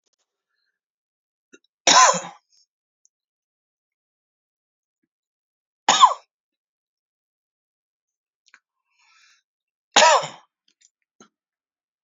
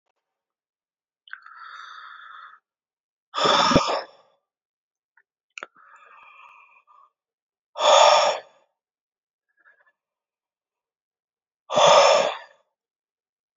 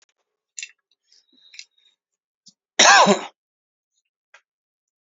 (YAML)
three_cough_length: 12.0 s
three_cough_amplitude: 32768
three_cough_signal_mean_std_ratio: 0.2
exhalation_length: 13.6 s
exhalation_amplitude: 25460
exhalation_signal_mean_std_ratio: 0.3
cough_length: 5.0 s
cough_amplitude: 30963
cough_signal_mean_std_ratio: 0.23
survey_phase: beta (2021-08-13 to 2022-03-07)
age: 18-44
gender: Male
wearing_mask: 'No'
symptom_none: true
smoker_status: Ex-smoker
respiratory_condition_asthma: false
respiratory_condition_other: false
recruitment_source: REACT
submission_delay: 21 days
covid_test_result: Negative
covid_test_method: RT-qPCR
influenza_a_test_result: Negative
influenza_b_test_result: Negative